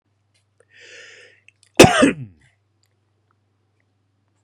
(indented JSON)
{
  "cough_length": "4.4 s",
  "cough_amplitude": 32768,
  "cough_signal_mean_std_ratio": 0.21,
  "survey_phase": "beta (2021-08-13 to 2022-03-07)",
  "age": "45-64",
  "gender": "Male",
  "wearing_mask": "No",
  "symptom_none": true,
  "smoker_status": "Ex-smoker",
  "respiratory_condition_asthma": false,
  "respiratory_condition_other": false,
  "recruitment_source": "REACT",
  "submission_delay": "2 days",
  "covid_test_result": "Negative",
  "covid_test_method": "RT-qPCR"
}